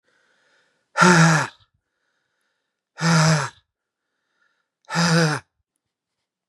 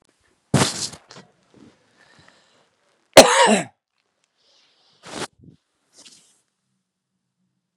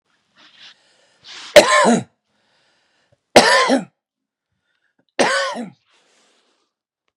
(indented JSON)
{
  "exhalation_length": "6.5 s",
  "exhalation_amplitude": 29531,
  "exhalation_signal_mean_std_ratio": 0.38,
  "cough_length": "7.8 s",
  "cough_amplitude": 32768,
  "cough_signal_mean_std_ratio": 0.21,
  "three_cough_length": "7.2 s",
  "three_cough_amplitude": 32768,
  "three_cough_signal_mean_std_ratio": 0.31,
  "survey_phase": "beta (2021-08-13 to 2022-03-07)",
  "age": "45-64",
  "gender": "Male",
  "wearing_mask": "No",
  "symptom_none": true,
  "symptom_onset": "12 days",
  "smoker_status": "Never smoked",
  "respiratory_condition_asthma": false,
  "respiratory_condition_other": false,
  "recruitment_source": "REACT",
  "submission_delay": "3 days",
  "covid_test_result": "Negative",
  "covid_test_method": "RT-qPCR",
  "influenza_a_test_result": "Negative",
  "influenza_b_test_result": "Negative"
}